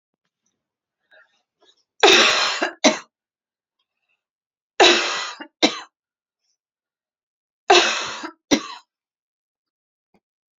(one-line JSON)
{"three_cough_length": "10.6 s", "three_cough_amplitude": 31207, "three_cough_signal_mean_std_ratio": 0.3, "survey_phase": "beta (2021-08-13 to 2022-03-07)", "age": "45-64", "gender": "Female", "wearing_mask": "No", "symptom_runny_or_blocked_nose": true, "smoker_status": "Never smoked", "respiratory_condition_asthma": false, "respiratory_condition_other": false, "recruitment_source": "REACT", "submission_delay": "6 days", "covid_test_result": "Negative", "covid_test_method": "RT-qPCR", "influenza_a_test_result": "Negative", "influenza_b_test_result": "Negative"}